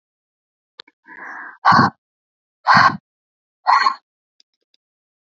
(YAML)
exhalation_length: 5.4 s
exhalation_amplitude: 31897
exhalation_signal_mean_std_ratio: 0.31
survey_phase: beta (2021-08-13 to 2022-03-07)
age: 45-64
gender: Female
wearing_mask: 'No'
symptom_none: true
smoker_status: Never smoked
respiratory_condition_asthma: false
respiratory_condition_other: false
recruitment_source: REACT
submission_delay: 4 days
covid_test_result: Negative
covid_test_method: RT-qPCR
influenza_a_test_result: Negative
influenza_b_test_result: Negative